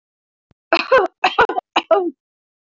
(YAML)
three_cough_length: 2.8 s
three_cough_amplitude: 25878
three_cough_signal_mean_std_ratio: 0.4
survey_phase: beta (2021-08-13 to 2022-03-07)
age: 18-44
gender: Female
wearing_mask: 'No'
symptom_cough_any: true
symptom_runny_or_blocked_nose: true
symptom_shortness_of_breath: true
symptom_fatigue: true
symptom_other: true
symptom_onset: 4 days
smoker_status: Never smoked
respiratory_condition_asthma: false
respiratory_condition_other: false
recruitment_source: Test and Trace
submission_delay: 1 day
covid_test_result: Positive
covid_test_method: RT-qPCR
covid_ct_value: 16.2
covid_ct_gene: ORF1ab gene
covid_ct_mean: 16.6
covid_viral_load: 3600000 copies/ml
covid_viral_load_category: High viral load (>1M copies/ml)